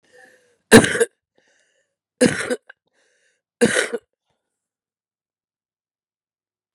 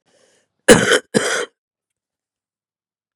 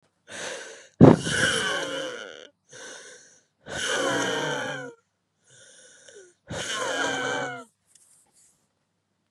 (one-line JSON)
{"three_cough_length": "6.7 s", "three_cough_amplitude": 32768, "three_cough_signal_mean_std_ratio": 0.23, "cough_length": "3.2 s", "cough_amplitude": 32768, "cough_signal_mean_std_ratio": 0.29, "exhalation_length": "9.3 s", "exhalation_amplitude": 32768, "exhalation_signal_mean_std_ratio": 0.38, "survey_phase": "beta (2021-08-13 to 2022-03-07)", "age": "45-64", "gender": "Female", "wearing_mask": "No", "symptom_cough_any": true, "symptom_new_continuous_cough": true, "symptom_runny_or_blocked_nose": true, "symptom_sore_throat": true, "symptom_headache": true, "symptom_onset": "4 days", "smoker_status": "Current smoker (11 or more cigarettes per day)", "respiratory_condition_asthma": false, "respiratory_condition_other": false, "recruitment_source": "Test and Trace", "submission_delay": "1 day", "covid_test_result": "Positive", "covid_test_method": "ePCR"}